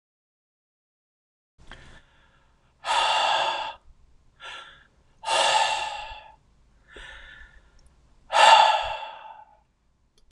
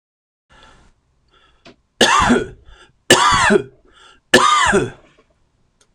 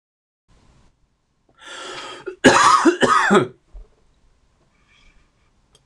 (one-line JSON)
{"exhalation_length": "10.3 s", "exhalation_amplitude": 23419, "exhalation_signal_mean_std_ratio": 0.37, "three_cough_length": "5.9 s", "three_cough_amplitude": 26028, "three_cough_signal_mean_std_ratio": 0.43, "cough_length": "5.9 s", "cough_amplitude": 26028, "cough_signal_mean_std_ratio": 0.35, "survey_phase": "beta (2021-08-13 to 2022-03-07)", "age": "45-64", "gender": "Male", "wearing_mask": "No", "symptom_none": true, "smoker_status": "Ex-smoker", "respiratory_condition_asthma": false, "respiratory_condition_other": false, "recruitment_source": "REACT", "submission_delay": "3 days", "covid_test_result": "Negative", "covid_test_method": "RT-qPCR", "influenza_a_test_result": "Negative", "influenza_b_test_result": "Negative"}